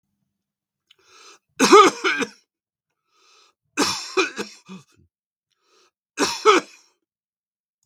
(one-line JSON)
{"three_cough_length": "7.9 s", "three_cough_amplitude": 32768, "three_cough_signal_mean_std_ratio": 0.28, "survey_phase": "beta (2021-08-13 to 2022-03-07)", "age": "65+", "gender": "Male", "wearing_mask": "No", "symptom_cough_any": true, "smoker_status": "Never smoked", "respiratory_condition_asthma": false, "respiratory_condition_other": false, "recruitment_source": "REACT", "submission_delay": "1 day", "covid_test_result": "Negative", "covid_test_method": "RT-qPCR"}